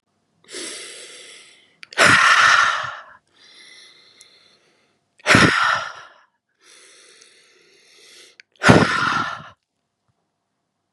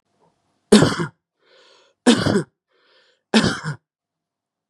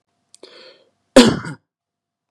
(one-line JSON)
{"exhalation_length": "10.9 s", "exhalation_amplitude": 32768, "exhalation_signal_mean_std_ratio": 0.37, "three_cough_length": "4.7 s", "three_cough_amplitude": 32767, "three_cough_signal_mean_std_ratio": 0.33, "cough_length": "2.3 s", "cough_amplitude": 32768, "cough_signal_mean_std_ratio": 0.24, "survey_phase": "beta (2021-08-13 to 2022-03-07)", "age": "18-44", "gender": "Male", "wearing_mask": "No", "symptom_none": true, "smoker_status": "Never smoked", "respiratory_condition_asthma": false, "respiratory_condition_other": false, "recruitment_source": "REACT", "submission_delay": "1 day", "covid_test_result": "Negative", "covid_test_method": "RT-qPCR", "influenza_a_test_result": "Negative", "influenza_b_test_result": "Negative"}